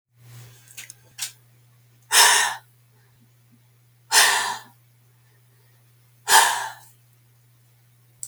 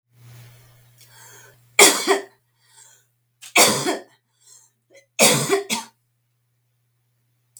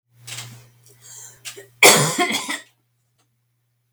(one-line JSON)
{"exhalation_length": "8.3 s", "exhalation_amplitude": 29973, "exhalation_signal_mean_std_ratio": 0.32, "three_cough_length": "7.6 s", "three_cough_amplitude": 32768, "three_cough_signal_mean_std_ratio": 0.31, "cough_length": "3.9 s", "cough_amplitude": 32768, "cough_signal_mean_std_ratio": 0.31, "survey_phase": "beta (2021-08-13 to 2022-03-07)", "age": "45-64", "gender": "Female", "wearing_mask": "No", "symptom_cough_any": true, "symptom_onset": "8 days", "smoker_status": "Never smoked", "respiratory_condition_asthma": false, "respiratory_condition_other": false, "recruitment_source": "REACT", "submission_delay": "4 days", "covid_test_result": "Negative", "covid_test_method": "RT-qPCR", "influenza_a_test_result": "Negative", "influenza_b_test_result": "Negative"}